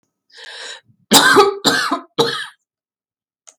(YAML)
cough_length: 3.6 s
cough_amplitude: 32768
cough_signal_mean_std_ratio: 0.42
survey_phase: beta (2021-08-13 to 2022-03-07)
age: 45-64
gender: Female
wearing_mask: 'No'
symptom_none: true
smoker_status: Ex-smoker
respiratory_condition_asthma: false
respiratory_condition_other: false
recruitment_source: REACT
submission_delay: 3 days
covid_test_result: Negative
covid_test_method: RT-qPCR
influenza_a_test_result: Negative
influenza_b_test_result: Negative